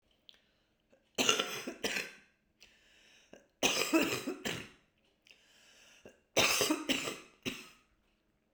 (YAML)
three_cough_length: 8.5 s
three_cough_amplitude: 10372
three_cough_signal_mean_std_ratio: 0.41
survey_phase: beta (2021-08-13 to 2022-03-07)
age: 45-64
gender: Female
wearing_mask: 'No'
symptom_new_continuous_cough: true
symptom_runny_or_blocked_nose: true
symptom_sore_throat: true
symptom_fatigue: true
symptom_fever_high_temperature: true
smoker_status: Prefer not to say
respiratory_condition_asthma: true
respiratory_condition_other: false
recruitment_source: Test and Trace
submission_delay: 3 days
covid_test_result: Positive
covid_test_method: RT-qPCR
covid_ct_value: 34.0
covid_ct_gene: N gene
covid_ct_mean: 34.0
covid_viral_load: 7.1 copies/ml
covid_viral_load_category: Minimal viral load (< 10K copies/ml)